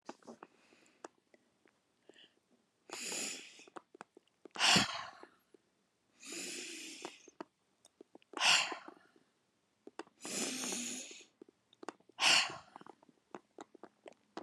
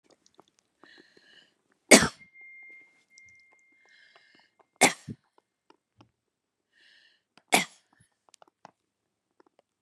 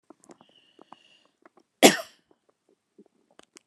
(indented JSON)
{
  "exhalation_length": "14.4 s",
  "exhalation_amplitude": 6906,
  "exhalation_signal_mean_std_ratio": 0.32,
  "three_cough_length": "9.8 s",
  "three_cough_amplitude": 32728,
  "three_cough_signal_mean_std_ratio": 0.15,
  "cough_length": "3.7 s",
  "cough_amplitude": 32748,
  "cough_signal_mean_std_ratio": 0.14,
  "survey_phase": "beta (2021-08-13 to 2022-03-07)",
  "age": "65+",
  "gender": "Female",
  "wearing_mask": "No",
  "symptom_none": true,
  "symptom_onset": "4 days",
  "smoker_status": "Ex-smoker",
  "respiratory_condition_asthma": false,
  "respiratory_condition_other": false,
  "recruitment_source": "REACT",
  "submission_delay": "1 day",
  "covid_test_result": "Negative",
  "covid_test_method": "RT-qPCR",
  "influenza_a_test_result": "Unknown/Void",
  "influenza_b_test_result": "Unknown/Void"
}